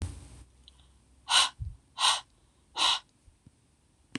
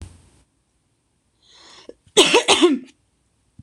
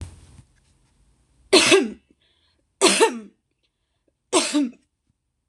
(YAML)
exhalation_length: 4.2 s
exhalation_amplitude: 11696
exhalation_signal_mean_std_ratio: 0.36
cough_length: 3.6 s
cough_amplitude: 26028
cough_signal_mean_std_ratio: 0.32
three_cough_length: 5.5 s
three_cough_amplitude: 26027
three_cough_signal_mean_std_ratio: 0.34
survey_phase: beta (2021-08-13 to 2022-03-07)
age: 18-44
gender: Female
wearing_mask: 'No'
symptom_none: true
smoker_status: Never smoked
respiratory_condition_asthma: false
respiratory_condition_other: false
recruitment_source: REACT
submission_delay: 2 days
covid_test_result: Negative
covid_test_method: RT-qPCR
influenza_a_test_result: Negative
influenza_b_test_result: Negative